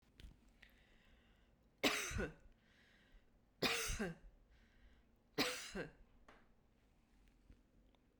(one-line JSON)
{"three_cough_length": "8.2 s", "three_cough_amplitude": 2862, "three_cough_signal_mean_std_ratio": 0.37, "survey_phase": "beta (2021-08-13 to 2022-03-07)", "age": "45-64", "gender": "Female", "wearing_mask": "No", "symptom_none": true, "smoker_status": "Never smoked", "respiratory_condition_asthma": false, "respiratory_condition_other": false, "recruitment_source": "REACT", "submission_delay": "0 days", "covid_test_result": "Negative", "covid_test_method": "RT-qPCR"}